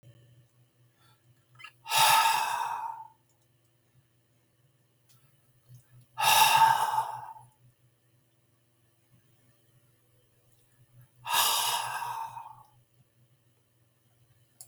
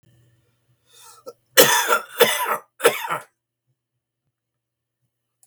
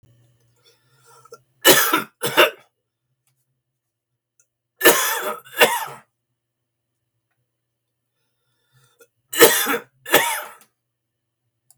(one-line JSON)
{"exhalation_length": "14.7 s", "exhalation_amplitude": 11190, "exhalation_signal_mean_std_ratio": 0.36, "cough_length": "5.5 s", "cough_amplitude": 32768, "cough_signal_mean_std_ratio": 0.32, "three_cough_length": "11.8 s", "three_cough_amplitude": 32768, "three_cough_signal_mean_std_ratio": 0.3, "survey_phase": "beta (2021-08-13 to 2022-03-07)", "age": "65+", "gender": "Male", "wearing_mask": "No", "symptom_none": true, "smoker_status": "Ex-smoker", "respiratory_condition_asthma": false, "respiratory_condition_other": false, "recruitment_source": "REACT", "submission_delay": "1 day", "covid_test_result": "Negative", "covid_test_method": "RT-qPCR"}